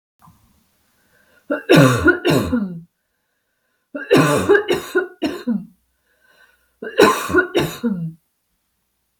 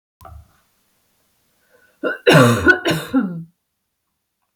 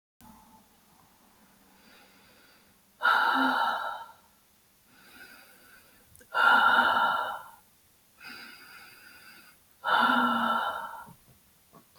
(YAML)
three_cough_length: 9.2 s
three_cough_amplitude: 32718
three_cough_signal_mean_std_ratio: 0.45
cough_length: 4.6 s
cough_amplitude: 32470
cough_signal_mean_std_ratio: 0.36
exhalation_length: 12.0 s
exhalation_amplitude: 12658
exhalation_signal_mean_std_ratio: 0.44
survey_phase: beta (2021-08-13 to 2022-03-07)
age: 18-44
gender: Female
wearing_mask: 'No'
symptom_runny_or_blocked_nose: true
symptom_fatigue: true
symptom_loss_of_taste: true
symptom_onset: 12 days
smoker_status: Never smoked
respiratory_condition_asthma: false
respiratory_condition_other: false
recruitment_source: REACT
submission_delay: 1 day
covid_test_result: Negative
covid_test_method: RT-qPCR
influenza_a_test_result: Negative
influenza_b_test_result: Negative